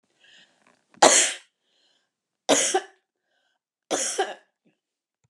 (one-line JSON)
{"three_cough_length": "5.3 s", "three_cough_amplitude": 29345, "three_cough_signal_mean_std_ratio": 0.3, "survey_phase": "beta (2021-08-13 to 2022-03-07)", "age": "65+", "gender": "Female", "wearing_mask": "No", "symptom_none": true, "smoker_status": "Ex-smoker", "respiratory_condition_asthma": false, "respiratory_condition_other": false, "recruitment_source": "REACT", "submission_delay": "1 day", "covid_test_result": "Negative", "covid_test_method": "RT-qPCR"}